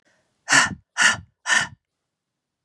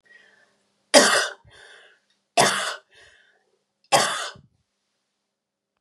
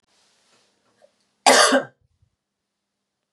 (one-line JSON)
{"exhalation_length": "2.6 s", "exhalation_amplitude": 30930, "exhalation_signal_mean_std_ratio": 0.37, "three_cough_length": "5.8 s", "three_cough_amplitude": 32767, "three_cough_signal_mean_std_ratio": 0.31, "cough_length": "3.3 s", "cough_amplitude": 31843, "cough_signal_mean_std_ratio": 0.26, "survey_phase": "beta (2021-08-13 to 2022-03-07)", "age": "45-64", "gender": "Female", "wearing_mask": "No", "symptom_cough_any": true, "symptom_runny_or_blocked_nose": true, "symptom_fatigue": true, "symptom_fever_high_temperature": true, "symptom_headache": true, "symptom_change_to_sense_of_smell_or_taste": true, "symptom_loss_of_taste": true, "smoker_status": "Ex-smoker", "respiratory_condition_asthma": false, "respiratory_condition_other": false, "recruitment_source": "Test and Trace", "submission_delay": "2 days", "covid_test_result": "Positive", "covid_test_method": "LFT"}